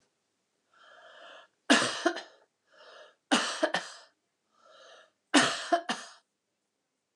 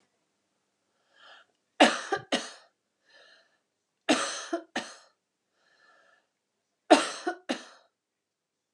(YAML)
three_cough_length: 7.2 s
three_cough_amplitude: 16123
three_cough_signal_mean_std_ratio: 0.32
cough_length: 8.7 s
cough_amplitude: 20552
cough_signal_mean_std_ratio: 0.25
survey_phase: beta (2021-08-13 to 2022-03-07)
age: 65+
gender: Female
wearing_mask: 'No'
symptom_runny_or_blocked_nose: true
smoker_status: Never smoked
respiratory_condition_asthma: false
respiratory_condition_other: false
recruitment_source: REACT
submission_delay: 2 days
covid_test_result: Negative
covid_test_method: RT-qPCR
influenza_a_test_result: Unknown/Void
influenza_b_test_result: Unknown/Void